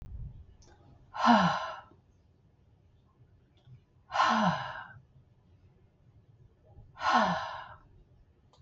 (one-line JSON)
{"exhalation_length": "8.6 s", "exhalation_amplitude": 11047, "exhalation_signal_mean_std_ratio": 0.37, "survey_phase": "beta (2021-08-13 to 2022-03-07)", "age": "45-64", "gender": "Female", "wearing_mask": "No", "symptom_none": true, "smoker_status": "Never smoked", "respiratory_condition_asthma": false, "respiratory_condition_other": false, "recruitment_source": "REACT", "submission_delay": "2 days", "covid_test_result": "Negative", "covid_test_method": "RT-qPCR", "influenza_a_test_result": "Negative", "influenza_b_test_result": "Negative"}